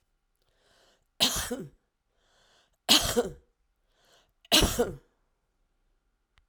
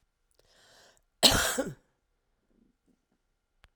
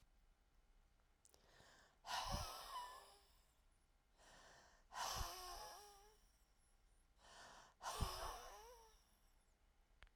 {"three_cough_length": "6.5 s", "three_cough_amplitude": 21783, "three_cough_signal_mean_std_ratio": 0.3, "cough_length": "3.8 s", "cough_amplitude": 22215, "cough_signal_mean_std_ratio": 0.24, "exhalation_length": "10.2 s", "exhalation_amplitude": 1169, "exhalation_signal_mean_std_ratio": 0.49, "survey_phase": "alpha (2021-03-01 to 2021-08-12)", "age": "65+", "gender": "Female", "wearing_mask": "No", "symptom_none": true, "smoker_status": "Ex-smoker", "respiratory_condition_asthma": false, "respiratory_condition_other": true, "recruitment_source": "REACT", "submission_delay": "2 days", "covid_test_result": "Negative", "covid_test_method": "RT-qPCR"}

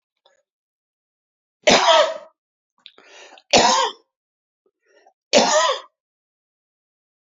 {"three_cough_length": "7.3 s", "three_cough_amplitude": 32768, "three_cough_signal_mean_std_ratio": 0.34, "survey_phase": "beta (2021-08-13 to 2022-03-07)", "age": "45-64", "gender": "Male", "wearing_mask": "No", "symptom_none": true, "smoker_status": "Ex-smoker", "respiratory_condition_asthma": false, "respiratory_condition_other": false, "recruitment_source": "REACT", "submission_delay": "2 days", "covid_test_result": "Negative", "covid_test_method": "RT-qPCR", "influenza_a_test_result": "Negative", "influenza_b_test_result": "Negative"}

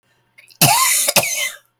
{"cough_length": "1.8 s", "cough_amplitude": 32768, "cough_signal_mean_std_ratio": 0.57, "survey_phase": "beta (2021-08-13 to 2022-03-07)", "age": "45-64", "gender": "Female", "wearing_mask": "No", "symptom_cough_any": true, "symptom_new_continuous_cough": true, "symptom_runny_or_blocked_nose": true, "symptom_shortness_of_breath": true, "symptom_sore_throat": true, "symptom_diarrhoea": true, "symptom_fever_high_temperature": true, "symptom_headache": true, "symptom_onset": "5 days", "smoker_status": "Never smoked", "respiratory_condition_asthma": true, "respiratory_condition_other": false, "recruitment_source": "Test and Trace", "submission_delay": "3 days", "covid_test_result": "Positive", "covid_test_method": "RT-qPCR", "covid_ct_value": 27.2, "covid_ct_gene": "N gene"}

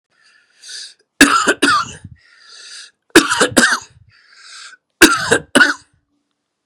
{"three_cough_length": "6.7 s", "three_cough_amplitude": 32768, "three_cough_signal_mean_std_ratio": 0.39, "survey_phase": "beta (2021-08-13 to 2022-03-07)", "age": "45-64", "gender": "Male", "wearing_mask": "No", "symptom_none": true, "smoker_status": "Never smoked", "respiratory_condition_asthma": false, "respiratory_condition_other": false, "recruitment_source": "REACT", "submission_delay": "4 days", "covid_test_result": "Negative", "covid_test_method": "RT-qPCR", "influenza_a_test_result": "Unknown/Void", "influenza_b_test_result": "Unknown/Void"}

